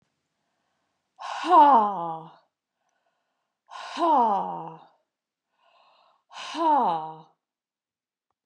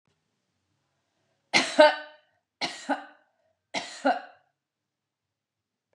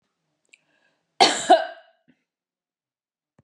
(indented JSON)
{
  "exhalation_length": "8.5 s",
  "exhalation_amplitude": 16806,
  "exhalation_signal_mean_std_ratio": 0.38,
  "three_cough_length": "5.9 s",
  "three_cough_amplitude": 20254,
  "three_cough_signal_mean_std_ratio": 0.25,
  "cough_length": "3.4 s",
  "cough_amplitude": 28134,
  "cough_signal_mean_std_ratio": 0.23,
  "survey_phase": "beta (2021-08-13 to 2022-03-07)",
  "age": "45-64",
  "gender": "Female",
  "wearing_mask": "No",
  "symptom_none": true,
  "symptom_onset": "6 days",
  "smoker_status": "Never smoked",
  "respiratory_condition_asthma": false,
  "respiratory_condition_other": false,
  "recruitment_source": "REACT",
  "submission_delay": "2 days",
  "covid_test_result": "Negative",
  "covid_test_method": "RT-qPCR",
  "influenza_a_test_result": "Unknown/Void",
  "influenza_b_test_result": "Unknown/Void"
}